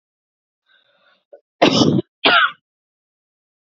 {"cough_length": "3.7 s", "cough_amplitude": 30562, "cough_signal_mean_std_ratio": 0.34, "survey_phase": "alpha (2021-03-01 to 2021-08-12)", "age": "18-44", "gender": "Female", "wearing_mask": "No", "symptom_headache": true, "smoker_status": "Never smoked", "respiratory_condition_asthma": false, "respiratory_condition_other": false, "recruitment_source": "Test and Trace", "submission_delay": "2 days", "covid_test_result": "Positive", "covid_test_method": "RT-qPCR", "covid_ct_value": 26.2, "covid_ct_gene": "N gene"}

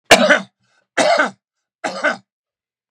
{"three_cough_length": "2.9 s", "three_cough_amplitude": 32768, "three_cough_signal_mean_std_ratio": 0.4, "survey_phase": "beta (2021-08-13 to 2022-03-07)", "age": "45-64", "gender": "Male", "wearing_mask": "No", "symptom_none": true, "smoker_status": "Ex-smoker", "respiratory_condition_asthma": true, "respiratory_condition_other": false, "recruitment_source": "REACT", "submission_delay": "1 day", "covid_test_result": "Negative", "covid_test_method": "RT-qPCR", "influenza_a_test_result": "Negative", "influenza_b_test_result": "Negative"}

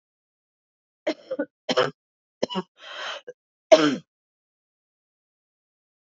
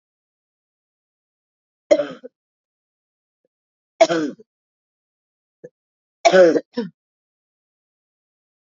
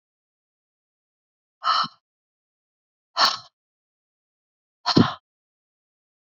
{"cough_length": "6.1 s", "cough_amplitude": 27358, "cough_signal_mean_std_ratio": 0.24, "three_cough_length": "8.7 s", "three_cough_amplitude": 28321, "three_cough_signal_mean_std_ratio": 0.22, "exhalation_length": "6.4 s", "exhalation_amplitude": 24503, "exhalation_signal_mean_std_ratio": 0.23, "survey_phase": "beta (2021-08-13 to 2022-03-07)", "age": "45-64", "gender": "Female", "wearing_mask": "No", "symptom_cough_any": true, "symptom_runny_or_blocked_nose": true, "symptom_shortness_of_breath": true, "symptom_sore_throat": true, "symptom_fatigue": true, "symptom_headache": true, "symptom_change_to_sense_of_smell_or_taste": true, "symptom_onset": "3 days", "smoker_status": "Never smoked", "respiratory_condition_asthma": false, "respiratory_condition_other": false, "recruitment_source": "Test and Trace", "submission_delay": "1 day", "covid_test_result": "Positive", "covid_test_method": "RT-qPCR", "covid_ct_value": 17.9, "covid_ct_gene": "N gene", "covid_ct_mean": 19.1, "covid_viral_load": "550000 copies/ml", "covid_viral_load_category": "Low viral load (10K-1M copies/ml)"}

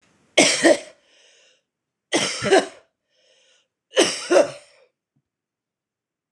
{"three_cough_length": "6.3 s", "three_cough_amplitude": 25956, "three_cough_signal_mean_std_ratio": 0.34, "survey_phase": "beta (2021-08-13 to 2022-03-07)", "age": "45-64", "gender": "Female", "wearing_mask": "No", "symptom_headache": true, "symptom_other": true, "smoker_status": "Never smoked", "respiratory_condition_asthma": false, "respiratory_condition_other": false, "recruitment_source": "REACT", "submission_delay": "1 day", "covid_test_result": "Negative", "covid_test_method": "RT-qPCR", "influenza_a_test_result": "Negative", "influenza_b_test_result": "Negative"}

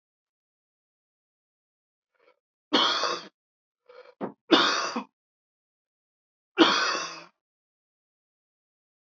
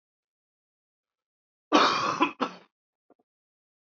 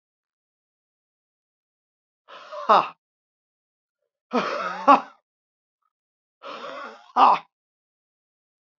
{"three_cough_length": "9.1 s", "three_cough_amplitude": 21832, "three_cough_signal_mean_std_ratio": 0.3, "cough_length": "3.8 s", "cough_amplitude": 14714, "cough_signal_mean_std_ratio": 0.3, "exhalation_length": "8.8 s", "exhalation_amplitude": 26716, "exhalation_signal_mean_std_ratio": 0.24, "survey_phase": "beta (2021-08-13 to 2022-03-07)", "age": "45-64", "gender": "Male", "wearing_mask": "No", "symptom_cough_any": true, "symptom_runny_or_blocked_nose": true, "symptom_sore_throat": true, "symptom_onset": "3 days", "smoker_status": "Never smoked", "respiratory_condition_asthma": false, "respiratory_condition_other": false, "recruitment_source": "Test and Trace", "submission_delay": "2 days", "covid_test_result": "Positive", "covid_test_method": "RT-qPCR", "covid_ct_value": 25.1, "covid_ct_gene": "ORF1ab gene", "covid_ct_mean": 25.6, "covid_viral_load": "3900 copies/ml", "covid_viral_load_category": "Minimal viral load (< 10K copies/ml)"}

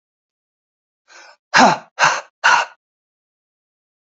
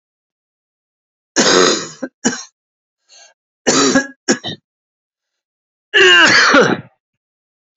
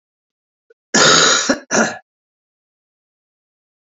{"exhalation_length": "4.0 s", "exhalation_amplitude": 30087, "exhalation_signal_mean_std_ratio": 0.31, "three_cough_length": "7.8 s", "three_cough_amplitude": 30483, "three_cough_signal_mean_std_ratio": 0.42, "cough_length": "3.8 s", "cough_amplitude": 31432, "cough_signal_mean_std_ratio": 0.37, "survey_phase": "beta (2021-08-13 to 2022-03-07)", "age": "45-64", "gender": "Male", "wearing_mask": "No", "symptom_cough_any": true, "symptom_runny_or_blocked_nose": true, "symptom_fatigue": true, "symptom_headache": true, "symptom_onset": "3 days", "smoker_status": "Never smoked", "respiratory_condition_asthma": false, "respiratory_condition_other": false, "recruitment_source": "Test and Trace", "submission_delay": "2 days", "covid_test_result": "Positive", "covid_test_method": "RT-qPCR", "covid_ct_value": 22.8, "covid_ct_gene": "ORF1ab gene"}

